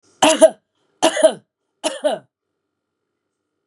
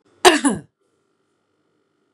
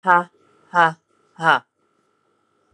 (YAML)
three_cough_length: 3.7 s
three_cough_amplitude: 32767
three_cough_signal_mean_std_ratio: 0.32
cough_length: 2.1 s
cough_amplitude: 32768
cough_signal_mean_std_ratio: 0.26
exhalation_length: 2.7 s
exhalation_amplitude: 29269
exhalation_signal_mean_std_ratio: 0.3
survey_phase: beta (2021-08-13 to 2022-03-07)
age: 45-64
gender: Female
wearing_mask: 'No'
symptom_cough_any: true
symptom_runny_or_blocked_nose: true
smoker_status: Ex-smoker
respiratory_condition_asthma: false
respiratory_condition_other: false
recruitment_source: Test and Trace
submission_delay: 10 days
covid_test_result: Negative
covid_test_method: RT-qPCR